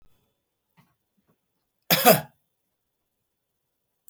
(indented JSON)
{
  "cough_length": "4.1 s",
  "cough_amplitude": 23760,
  "cough_signal_mean_std_ratio": 0.19,
  "survey_phase": "beta (2021-08-13 to 2022-03-07)",
  "age": "45-64",
  "gender": "Male",
  "wearing_mask": "No",
  "symptom_none": true,
  "smoker_status": "Never smoked",
  "respiratory_condition_asthma": false,
  "respiratory_condition_other": false,
  "recruitment_source": "REACT",
  "submission_delay": "3 days",
  "covid_test_result": "Negative",
  "covid_test_method": "RT-qPCR"
}